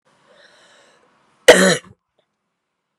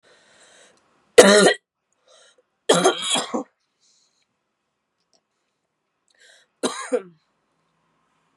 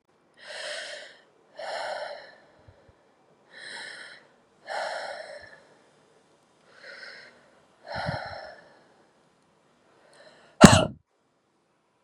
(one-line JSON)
{"cough_length": "3.0 s", "cough_amplitude": 32768, "cough_signal_mean_std_ratio": 0.23, "three_cough_length": "8.4 s", "three_cough_amplitude": 32768, "three_cough_signal_mean_std_ratio": 0.26, "exhalation_length": "12.0 s", "exhalation_amplitude": 32768, "exhalation_signal_mean_std_ratio": 0.21, "survey_phase": "beta (2021-08-13 to 2022-03-07)", "age": "18-44", "gender": "Female", "wearing_mask": "No", "symptom_cough_any": true, "symptom_new_continuous_cough": true, "symptom_runny_or_blocked_nose": true, "symptom_fatigue": true, "symptom_other": true, "smoker_status": "Never smoked", "respiratory_condition_asthma": false, "respiratory_condition_other": false, "recruitment_source": "Test and Trace", "submission_delay": "1 day", "covid_test_result": "Positive", "covid_test_method": "ePCR"}